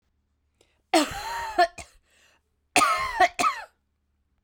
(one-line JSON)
{"cough_length": "4.4 s", "cough_amplitude": 18089, "cough_signal_mean_std_ratio": 0.4, "survey_phase": "beta (2021-08-13 to 2022-03-07)", "age": "45-64", "gender": "Female", "wearing_mask": "No", "symptom_new_continuous_cough": true, "symptom_runny_or_blocked_nose": true, "symptom_sore_throat": true, "symptom_fatigue": true, "symptom_fever_high_temperature": true, "symptom_headache": true, "symptom_change_to_sense_of_smell_or_taste": true, "symptom_loss_of_taste": true, "symptom_onset": "5 days", "smoker_status": "Ex-smoker", "respiratory_condition_asthma": false, "respiratory_condition_other": false, "recruitment_source": "Test and Trace", "submission_delay": "1 day", "covid_test_result": "Positive", "covid_test_method": "RT-qPCR", "covid_ct_value": 14.1, "covid_ct_gene": "ORF1ab gene", "covid_ct_mean": 14.5, "covid_viral_load": "18000000 copies/ml", "covid_viral_load_category": "High viral load (>1M copies/ml)"}